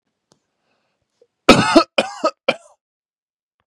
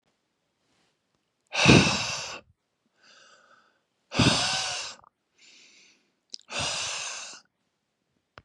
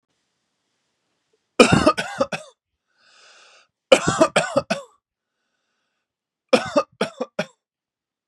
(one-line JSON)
{"cough_length": "3.7 s", "cough_amplitude": 32768, "cough_signal_mean_std_ratio": 0.27, "exhalation_length": "8.4 s", "exhalation_amplitude": 26713, "exhalation_signal_mean_std_ratio": 0.33, "three_cough_length": "8.3 s", "three_cough_amplitude": 32767, "three_cough_signal_mean_std_ratio": 0.28, "survey_phase": "beta (2021-08-13 to 2022-03-07)", "age": "18-44", "gender": "Male", "wearing_mask": "No", "symptom_none": true, "smoker_status": "Never smoked", "respiratory_condition_asthma": false, "respiratory_condition_other": false, "recruitment_source": "REACT", "submission_delay": "1 day", "covid_test_result": "Negative", "covid_test_method": "RT-qPCR", "influenza_a_test_result": "Negative", "influenza_b_test_result": "Negative"}